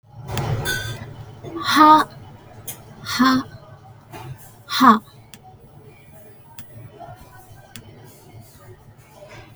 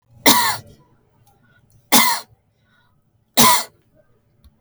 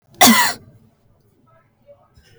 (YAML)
exhalation_length: 9.6 s
exhalation_amplitude: 31928
exhalation_signal_mean_std_ratio: 0.36
three_cough_length: 4.6 s
three_cough_amplitude: 32768
three_cough_signal_mean_std_ratio: 0.34
cough_length: 2.4 s
cough_amplitude: 32768
cough_signal_mean_std_ratio: 0.3
survey_phase: beta (2021-08-13 to 2022-03-07)
age: 45-64
gender: Female
wearing_mask: 'Yes'
symptom_none: true
smoker_status: Never smoked
respiratory_condition_asthma: false
respiratory_condition_other: false
recruitment_source: REACT
submission_delay: 4 days
covid_test_result: Negative
covid_test_method: RT-qPCR
influenza_a_test_result: Negative
influenza_b_test_result: Negative